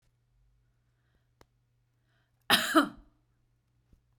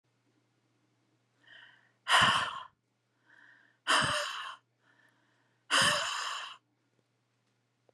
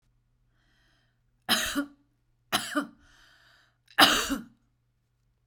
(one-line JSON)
{"cough_length": "4.2 s", "cough_amplitude": 11460, "cough_signal_mean_std_ratio": 0.22, "exhalation_length": "7.9 s", "exhalation_amplitude": 8834, "exhalation_signal_mean_std_ratio": 0.36, "three_cough_length": "5.5 s", "three_cough_amplitude": 25015, "three_cough_signal_mean_std_ratio": 0.3, "survey_phase": "beta (2021-08-13 to 2022-03-07)", "age": "45-64", "gender": "Female", "wearing_mask": "No", "symptom_cough_any": true, "smoker_status": "Never smoked", "respiratory_condition_asthma": false, "respiratory_condition_other": false, "recruitment_source": "REACT", "submission_delay": "1 day", "covid_test_result": "Negative", "covid_test_method": "RT-qPCR", "influenza_a_test_result": "Negative", "influenza_b_test_result": "Negative"}